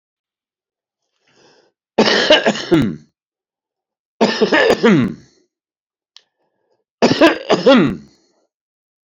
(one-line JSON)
{"three_cough_length": "9.0 s", "three_cough_amplitude": 30333, "three_cough_signal_mean_std_ratio": 0.41, "survey_phase": "beta (2021-08-13 to 2022-03-07)", "age": "65+", "gender": "Male", "wearing_mask": "No", "symptom_none": true, "symptom_onset": "10 days", "smoker_status": "Ex-smoker", "respiratory_condition_asthma": false, "respiratory_condition_other": true, "recruitment_source": "REACT", "submission_delay": "1 day", "covid_test_result": "Negative", "covid_test_method": "RT-qPCR", "influenza_a_test_result": "Negative", "influenza_b_test_result": "Negative"}